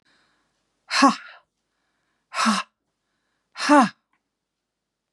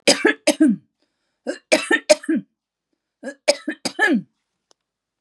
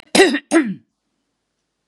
{"exhalation_length": "5.1 s", "exhalation_amplitude": 25495, "exhalation_signal_mean_std_ratio": 0.29, "three_cough_length": "5.2 s", "three_cough_amplitude": 31995, "three_cough_signal_mean_std_ratio": 0.39, "cough_length": "1.9 s", "cough_amplitude": 32767, "cough_signal_mean_std_ratio": 0.38, "survey_phase": "beta (2021-08-13 to 2022-03-07)", "age": "65+", "gender": "Female", "wearing_mask": "No", "symptom_none": true, "smoker_status": "Never smoked", "respiratory_condition_asthma": false, "respiratory_condition_other": false, "recruitment_source": "REACT", "submission_delay": "3 days", "covid_test_result": "Negative", "covid_test_method": "RT-qPCR", "influenza_a_test_result": "Negative", "influenza_b_test_result": "Negative"}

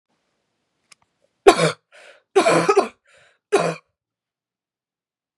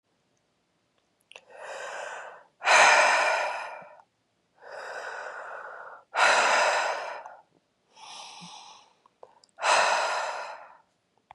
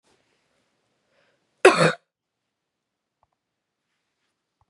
{"three_cough_length": "5.4 s", "three_cough_amplitude": 32768, "three_cough_signal_mean_std_ratio": 0.3, "exhalation_length": "11.3 s", "exhalation_amplitude": 17673, "exhalation_signal_mean_std_ratio": 0.45, "cough_length": "4.7 s", "cough_amplitude": 32357, "cough_signal_mean_std_ratio": 0.17, "survey_phase": "beta (2021-08-13 to 2022-03-07)", "age": "18-44", "gender": "Female", "wearing_mask": "No", "symptom_cough_any": true, "symptom_new_continuous_cough": true, "symptom_runny_or_blocked_nose": true, "symptom_shortness_of_breath": true, "symptom_sore_throat": true, "symptom_fatigue": true, "symptom_other": true, "symptom_onset": "4 days", "smoker_status": "Never smoked", "respiratory_condition_asthma": false, "respiratory_condition_other": false, "recruitment_source": "Test and Trace", "submission_delay": "3 days", "covid_test_result": "Positive", "covid_test_method": "RT-qPCR"}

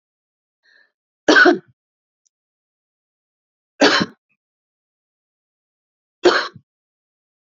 {"three_cough_length": "7.5 s", "three_cough_amplitude": 32462, "three_cough_signal_mean_std_ratio": 0.24, "survey_phase": "beta (2021-08-13 to 2022-03-07)", "age": "65+", "gender": "Female", "wearing_mask": "No", "symptom_none": true, "smoker_status": "Never smoked", "respiratory_condition_asthma": false, "respiratory_condition_other": false, "recruitment_source": "REACT", "submission_delay": "1 day", "covid_test_result": "Negative", "covid_test_method": "RT-qPCR", "influenza_a_test_result": "Negative", "influenza_b_test_result": "Negative"}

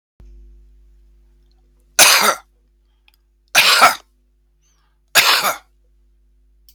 {"three_cough_length": "6.7 s", "three_cough_amplitude": 32768, "three_cough_signal_mean_std_ratio": 0.33, "survey_phase": "beta (2021-08-13 to 2022-03-07)", "age": "45-64", "gender": "Male", "wearing_mask": "No", "symptom_runny_or_blocked_nose": true, "symptom_sore_throat": true, "symptom_headache": true, "symptom_other": true, "smoker_status": "Current smoker (11 or more cigarettes per day)", "respiratory_condition_asthma": false, "respiratory_condition_other": false, "recruitment_source": "Test and Trace", "submission_delay": "2 days", "covid_test_result": "Positive", "covid_test_method": "RT-qPCR", "covid_ct_value": 20.7, "covid_ct_gene": "ORF1ab gene", "covid_ct_mean": 20.9, "covid_viral_load": "140000 copies/ml", "covid_viral_load_category": "Low viral load (10K-1M copies/ml)"}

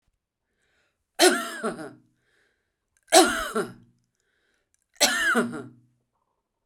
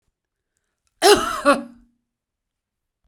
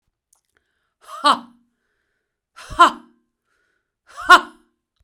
{"three_cough_length": "6.7 s", "three_cough_amplitude": 25630, "three_cough_signal_mean_std_ratio": 0.34, "cough_length": "3.1 s", "cough_amplitude": 32241, "cough_signal_mean_std_ratio": 0.29, "exhalation_length": "5.0 s", "exhalation_amplitude": 32768, "exhalation_signal_mean_std_ratio": 0.21, "survey_phase": "beta (2021-08-13 to 2022-03-07)", "age": "45-64", "gender": "Female", "wearing_mask": "No", "symptom_none": true, "smoker_status": "Ex-smoker", "respiratory_condition_asthma": false, "respiratory_condition_other": false, "recruitment_source": "REACT", "submission_delay": "1 day", "covid_test_result": "Negative", "covid_test_method": "RT-qPCR"}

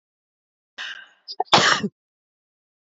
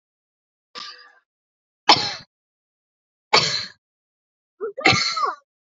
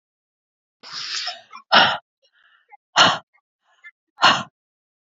{"cough_length": "2.8 s", "cough_amplitude": 27302, "cough_signal_mean_std_ratio": 0.29, "three_cough_length": "5.7 s", "three_cough_amplitude": 30327, "three_cough_signal_mean_std_ratio": 0.32, "exhalation_length": "5.1 s", "exhalation_amplitude": 28716, "exhalation_signal_mean_std_ratio": 0.31, "survey_phase": "beta (2021-08-13 to 2022-03-07)", "age": "45-64", "gender": "Female", "wearing_mask": "No", "symptom_none": true, "smoker_status": "Ex-smoker", "respiratory_condition_asthma": false, "respiratory_condition_other": false, "recruitment_source": "REACT", "submission_delay": "0 days", "covid_test_result": "Negative", "covid_test_method": "RT-qPCR"}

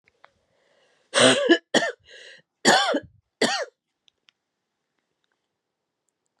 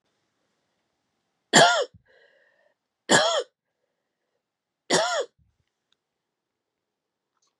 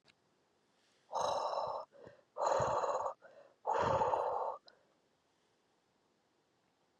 {"cough_length": "6.4 s", "cough_amplitude": 25586, "cough_signal_mean_std_ratio": 0.32, "three_cough_length": "7.6 s", "three_cough_amplitude": 27712, "three_cough_signal_mean_std_ratio": 0.27, "exhalation_length": "7.0 s", "exhalation_amplitude": 3304, "exhalation_signal_mean_std_ratio": 0.5, "survey_phase": "beta (2021-08-13 to 2022-03-07)", "age": "45-64", "gender": "Female", "wearing_mask": "No", "symptom_cough_any": true, "symptom_runny_or_blocked_nose": true, "symptom_onset": "13 days", "smoker_status": "Ex-smoker", "respiratory_condition_asthma": false, "respiratory_condition_other": false, "recruitment_source": "REACT", "submission_delay": "3 days", "covid_test_result": "Positive", "covid_test_method": "RT-qPCR", "covid_ct_value": 26.9, "covid_ct_gene": "N gene", "influenza_a_test_result": "Negative", "influenza_b_test_result": "Negative"}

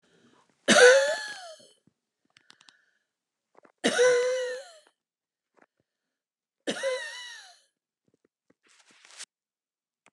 {"three_cough_length": "10.1 s", "three_cough_amplitude": 21148, "three_cough_signal_mean_std_ratio": 0.3, "survey_phase": "beta (2021-08-13 to 2022-03-07)", "age": "65+", "gender": "Female", "wearing_mask": "No", "symptom_cough_any": true, "symptom_shortness_of_breath": true, "symptom_fatigue": true, "symptom_onset": "12 days", "smoker_status": "Never smoked", "respiratory_condition_asthma": false, "respiratory_condition_other": true, "recruitment_source": "REACT", "submission_delay": "3 days", "covid_test_result": "Negative", "covid_test_method": "RT-qPCR", "influenza_a_test_result": "Negative", "influenza_b_test_result": "Negative"}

